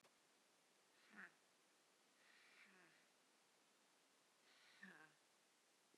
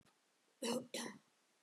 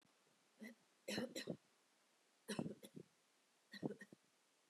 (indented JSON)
{
  "exhalation_length": "6.0 s",
  "exhalation_amplitude": 186,
  "exhalation_signal_mean_std_ratio": 0.68,
  "cough_length": "1.6 s",
  "cough_amplitude": 1379,
  "cough_signal_mean_std_ratio": 0.43,
  "three_cough_length": "4.7 s",
  "three_cough_amplitude": 1104,
  "three_cough_signal_mean_std_ratio": 0.38,
  "survey_phase": "beta (2021-08-13 to 2022-03-07)",
  "age": "65+",
  "gender": "Female",
  "wearing_mask": "No",
  "symptom_sore_throat": true,
  "symptom_headache": true,
  "symptom_onset": "2 days",
  "smoker_status": "Never smoked",
  "respiratory_condition_asthma": false,
  "respiratory_condition_other": false,
  "recruitment_source": "Test and Trace",
  "submission_delay": "1 day",
  "covid_test_result": "Negative",
  "covid_test_method": "RT-qPCR"
}